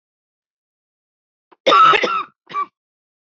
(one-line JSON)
{"cough_length": "3.3 s", "cough_amplitude": 27173, "cough_signal_mean_std_ratio": 0.34, "survey_phase": "beta (2021-08-13 to 2022-03-07)", "age": "45-64", "gender": "Female", "wearing_mask": "No", "symptom_cough_any": true, "symptom_runny_or_blocked_nose": true, "symptom_fatigue": true, "symptom_onset": "2 days", "smoker_status": "Never smoked", "respiratory_condition_asthma": false, "respiratory_condition_other": false, "recruitment_source": "Test and Trace", "submission_delay": "2 days", "covid_test_result": "Positive", "covid_test_method": "RT-qPCR", "covid_ct_value": 15.3, "covid_ct_gene": "ORF1ab gene", "covid_ct_mean": 15.6, "covid_viral_load": "7800000 copies/ml", "covid_viral_load_category": "High viral load (>1M copies/ml)"}